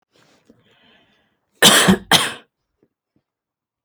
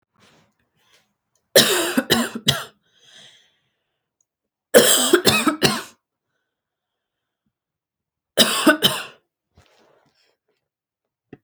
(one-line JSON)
{"cough_length": "3.8 s", "cough_amplitude": 32768, "cough_signal_mean_std_ratio": 0.29, "three_cough_length": "11.4 s", "three_cough_amplitude": 32768, "three_cough_signal_mean_std_ratio": 0.32, "survey_phase": "beta (2021-08-13 to 2022-03-07)", "age": "18-44", "gender": "Female", "wearing_mask": "No", "symptom_fatigue": true, "symptom_onset": "12 days", "smoker_status": "Never smoked", "respiratory_condition_asthma": false, "respiratory_condition_other": false, "recruitment_source": "REACT", "submission_delay": "2 days", "covid_test_result": "Negative", "covid_test_method": "RT-qPCR"}